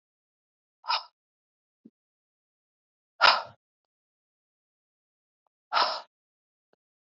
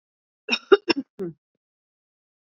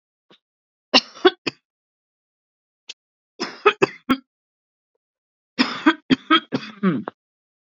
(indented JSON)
{
  "exhalation_length": "7.2 s",
  "exhalation_amplitude": 20709,
  "exhalation_signal_mean_std_ratio": 0.19,
  "cough_length": "2.6 s",
  "cough_amplitude": 25879,
  "cough_signal_mean_std_ratio": 0.21,
  "three_cough_length": "7.7 s",
  "three_cough_amplitude": 27636,
  "three_cough_signal_mean_std_ratio": 0.27,
  "survey_phase": "beta (2021-08-13 to 2022-03-07)",
  "age": "45-64",
  "gender": "Female",
  "wearing_mask": "No",
  "symptom_cough_any": true,
  "symptom_runny_or_blocked_nose": true,
  "symptom_shortness_of_breath": true,
  "symptom_sore_throat": true,
  "symptom_fatigue": true,
  "symptom_fever_high_temperature": true,
  "symptom_headache": true,
  "symptom_onset": "6 days",
  "smoker_status": "Ex-smoker",
  "respiratory_condition_asthma": true,
  "respiratory_condition_other": true,
  "recruitment_source": "Test and Trace",
  "submission_delay": "2 days",
  "covid_test_result": "Positive",
  "covid_test_method": "RT-qPCR",
  "covid_ct_value": 18.3,
  "covid_ct_gene": "N gene"
}